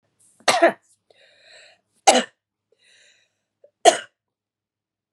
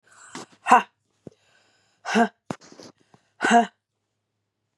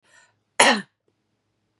{"three_cough_length": "5.1 s", "three_cough_amplitude": 32767, "three_cough_signal_mean_std_ratio": 0.23, "exhalation_length": "4.8 s", "exhalation_amplitude": 30130, "exhalation_signal_mean_std_ratio": 0.27, "cough_length": "1.8 s", "cough_amplitude": 32667, "cough_signal_mean_std_ratio": 0.25, "survey_phase": "beta (2021-08-13 to 2022-03-07)", "age": "45-64", "gender": "Female", "wearing_mask": "No", "symptom_cough_any": true, "symptom_runny_or_blocked_nose": true, "symptom_shortness_of_breath": true, "symptom_sore_throat": true, "symptom_abdominal_pain": true, "symptom_diarrhoea": true, "symptom_fatigue": true, "symptom_fever_high_temperature": true, "symptom_other": true, "symptom_onset": "3 days", "smoker_status": "Never smoked", "respiratory_condition_asthma": false, "respiratory_condition_other": false, "recruitment_source": "Test and Trace", "submission_delay": "2 days", "covid_test_result": "Positive", "covid_test_method": "RT-qPCR", "covid_ct_value": 25.4, "covid_ct_gene": "ORF1ab gene", "covid_ct_mean": 25.8, "covid_viral_load": "3400 copies/ml", "covid_viral_load_category": "Minimal viral load (< 10K copies/ml)"}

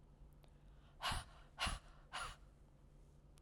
{"exhalation_length": "3.4 s", "exhalation_amplitude": 1389, "exhalation_signal_mean_std_ratio": 0.51, "survey_phase": "alpha (2021-03-01 to 2021-08-12)", "age": "65+", "gender": "Female", "wearing_mask": "No", "symptom_none": true, "smoker_status": "Never smoked", "respiratory_condition_asthma": false, "respiratory_condition_other": false, "recruitment_source": "REACT", "submission_delay": "1 day", "covid_test_result": "Negative", "covid_test_method": "RT-qPCR"}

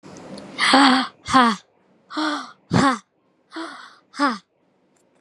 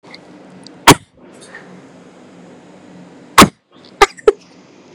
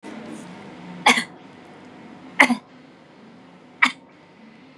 {"exhalation_length": "5.2 s", "exhalation_amplitude": 32546, "exhalation_signal_mean_std_ratio": 0.43, "cough_length": "4.9 s", "cough_amplitude": 32768, "cough_signal_mean_std_ratio": 0.23, "three_cough_length": "4.8 s", "three_cough_amplitude": 32767, "three_cough_signal_mean_std_ratio": 0.3, "survey_phase": "beta (2021-08-13 to 2022-03-07)", "age": "18-44", "gender": "Female", "wearing_mask": "Yes", "symptom_none": true, "smoker_status": "Never smoked", "respiratory_condition_asthma": false, "respiratory_condition_other": false, "recruitment_source": "REACT", "submission_delay": "0 days", "covid_test_result": "Negative", "covid_test_method": "RT-qPCR", "influenza_a_test_result": "Negative", "influenza_b_test_result": "Negative"}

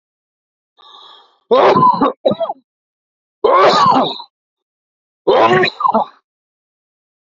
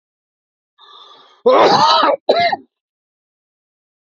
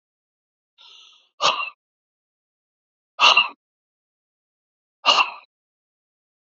{"three_cough_length": "7.3 s", "three_cough_amplitude": 32768, "three_cough_signal_mean_std_ratio": 0.47, "cough_length": "4.2 s", "cough_amplitude": 29663, "cough_signal_mean_std_ratio": 0.41, "exhalation_length": "6.6 s", "exhalation_amplitude": 29356, "exhalation_signal_mean_std_ratio": 0.25, "survey_phase": "alpha (2021-03-01 to 2021-08-12)", "age": "45-64", "gender": "Male", "wearing_mask": "No", "symptom_none": true, "smoker_status": "Ex-smoker", "respiratory_condition_asthma": true, "respiratory_condition_other": false, "recruitment_source": "REACT", "submission_delay": "1 day", "covid_test_result": "Negative", "covid_test_method": "RT-qPCR"}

